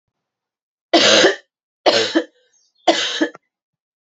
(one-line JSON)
{"three_cough_length": "4.1 s", "three_cough_amplitude": 32146, "three_cough_signal_mean_std_ratio": 0.41, "survey_phase": "beta (2021-08-13 to 2022-03-07)", "age": "18-44", "gender": "Female", "wearing_mask": "No", "symptom_cough_any": true, "symptom_runny_or_blocked_nose": true, "symptom_sore_throat": true, "symptom_fatigue": true, "symptom_headache": true, "symptom_other": true, "symptom_onset": "4 days", "smoker_status": "Never smoked", "respiratory_condition_asthma": false, "respiratory_condition_other": false, "recruitment_source": "Test and Trace", "submission_delay": "2 days", "covid_test_result": "Positive", "covid_test_method": "RT-qPCR", "covid_ct_value": 35.0, "covid_ct_gene": "ORF1ab gene"}